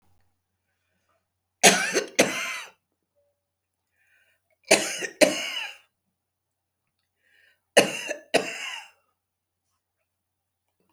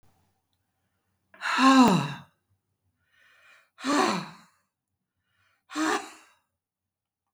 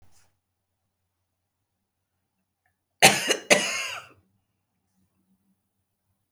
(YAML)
three_cough_length: 10.9 s
three_cough_amplitude: 32598
three_cough_signal_mean_std_ratio: 0.27
exhalation_length: 7.3 s
exhalation_amplitude: 13813
exhalation_signal_mean_std_ratio: 0.32
cough_length: 6.3 s
cough_amplitude: 30128
cough_signal_mean_std_ratio: 0.21
survey_phase: beta (2021-08-13 to 2022-03-07)
age: 65+
gender: Female
wearing_mask: 'No'
symptom_fatigue: true
smoker_status: Ex-smoker
respiratory_condition_asthma: false
respiratory_condition_other: false
recruitment_source: REACT
submission_delay: 1 day
covid_test_result: Negative
covid_test_method: RT-qPCR
influenza_a_test_result: Negative
influenza_b_test_result: Negative